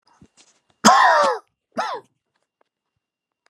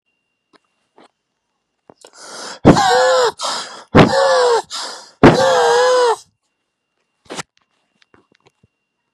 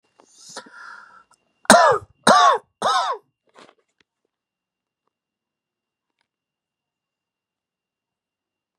{"cough_length": "3.5 s", "cough_amplitude": 32768, "cough_signal_mean_std_ratio": 0.34, "exhalation_length": "9.1 s", "exhalation_amplitude": 32768, "exhalation_signal_mean_std_ratio": 0.44, "three_cough_length": "8.8 s", "three_cough_amplitude": 32768, "three_cough_signal_mean_std_ratio": 0.25, "survey_phase": "beta (2021-08-13 to 2022-03-07)", "age": "45-64", "gender": "Male", "wearing_mask": "No", "symptom_runny_or_blocked_nose": true, "symptom_shortness_of_breath": true, "symptom_abdominal_pain": true, "symptom_diarrhoea": true, "symptom_fatigue": true, "symptom_fever_high_temperature": true, "symptom_headache": true, "symptom_change_to_sense_of_smell_or_taste": true, "smoker_status": "Current smoker (1 to 10 cigarettes per day)", "respiratory_condition_asthma": false, "respiratory_condition_other": false, "recruitment_source": "REACT", "submission_delay": "4 days", "covid_test_result": "Negative", "covid_test_method": "RT-qPCR"}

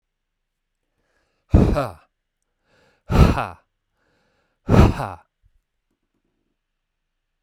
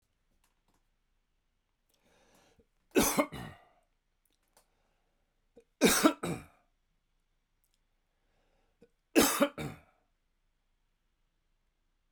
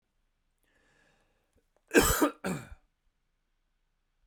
{"exhalation_length": "7.4 s", "exhalation_amplitude": 32768, "exhalation_signal_mean_std_ratio": 0.27, "three_cough_length": "12.1 s", "three_cough_amplitude": 12902, "three_cough_signal_mean_std_ratio": 0.23, "cough_length": "4.3 s", "cough_amplitude": 12824, "cough_signal_mean_std_ratio": 0.25, "survey_phase": "beta (2021-08-13 to 2022-03-07)", "age": "45-64", "gender": "Male", "wearing_mask": "No", "symptom_none": true, "smoker_status": "Never smoked", "respiratory_condition_asthma": true, "respiratory_condition_other": false, "recruitment_source": "REACT", "submission_delay": "2 days", "covid_test_result": "Negative", "covid_test_method": "RT-qPCR"}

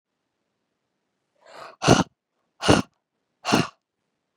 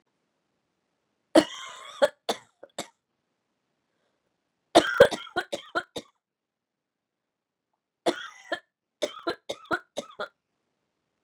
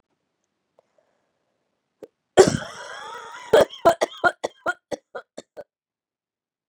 {"exhalation_length": "4.4 s", "exhalation_amplitude": 29386, "exhalation_signal_mean_std_ratio": 0.26, "three_cough_length": "11.2 s", "three_cough_amplitude": 21893, "three_cough_signal_mean_std_ratio": 0.21, "cough_length": "6.7 s", "cough_amplitude": 31286, "cough_signal_mean_std_ratio": 0.25, "survey_phase": "beta (2021-08-13 to 2022-03-07)", "age": "45-64", "gender": "Female", "wearing_mask": "No", "symptom_cough_any": true, "symptom_runny_or_blocked_nose": true, "symptom_shortness_of_breath": true, "symptom_sore_throat": true, "symptom_fatigue": true, "symptom_headache": true, "symptom_onset": "3 days", "smoker_status": "Never smoked", "respiratory_condition_asthma": true, "respiratory_condition_other": false, "recruitment_source": "Test and Trace", "submission_delay": "2 days", "covid_test_result": "Positive", "covid_test_method": "RT-qPCR", "covid_ct_value": 21.2, "covid_ct_gene": "N gene", "covid_ct_mean": 21.6, "covid_viral_load": "84000 copies/ml", "covid_viral_load_category": "Low viral load (10K-1M copies/ml)"}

